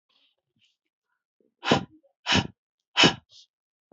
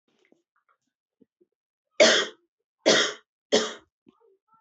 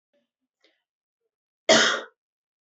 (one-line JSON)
{"exhalation_length": "3.9 s", "exhalation_amplitude": 21612, "exhalation_signal_mean_std_ratio": 0.26, "three_cough_length": "4.6 s", "three_cough_amplitude": 18224, "three_cough_signal_mean_std_ratio": 0.29, "cough_length": "2.6 s", "cough_amplitude": 19291, "cough_signal_mean_std_ratio": 0.26, "survey_phase": "beta (2021-08-13 to 2022-03-07)", "age": "18-44", "gender": "Female", "wearing_mask": "No", "symptom_none": true, "smoker_status": "Never smoked", "respiratory_condition_asthma": false, "respiratory_condition_other": false, "recruitment_source": "Test and Trace", "submission_delay": "0 days", "covid_test_result": "Negative", "covid_test_method": "LFT"}